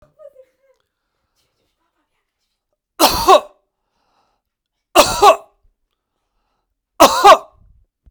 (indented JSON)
{
  "three_cough_length": "8.1 s",
  "three_cough_amplitude": 32768,
  "three_cough_signal_mean_std_ratio": 0.27,
  "survey_phase": "beta (2021-08-13 to 2022-03-07)",
  "age": "18-44",
  "gender": "Male",
  "wearing_mask": "No",
  "symptom_none": true,
  "smoker_status": "Never smoked",
  "respiratory_condition_asthma": false,
  "respiratory_condition_other": false,
  "recruitment_source": "REACT",
  "submission_delay": "1 day",
  "covid_test_result": "Negative",
  "covid_test_method": "RT-qPCR"
}